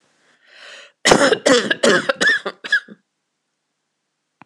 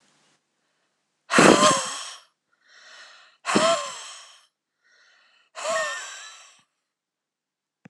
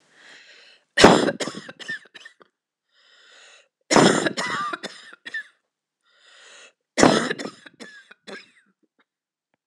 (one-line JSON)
{"cough_length": "4.5 s", "cough_amplitude": 26028, "cough_signal_mean_std_ratio": 0.41, "exhalation_length": "7.9 s", "exhalation_amplitude": 26028, "exhalation_signal_mean_std_ratio": 0.32, "three_cough_length": "9.7 s", "three_cough_amplitude": 26028, "three_cough_signal_mean_std_ratio": 0.3, "survey_phase": "beta (2021-08-13 to 2022-03-07)", "age": "45-64", "gender": "Female", "wearing_mask": "No", "symptom_cough_any": true, "symptom_sore_throat": true, "symptom_fatigue": true, "symptom_headache": true, "symptom_other": true, "symptom_onset": "4 days", "smoker_status": "Never smoked", "respiratory_condition_asthma": false, "respiratory_condition_other": false, "recruitment_source": "Test and Trace", "submission_delay": "1 day", "covid_test_result": "Positive", "covid_test_method": "RT-qPCR", "covid_ct_value": 16.7, "covid_ct_gene": "ORF1ab gene"}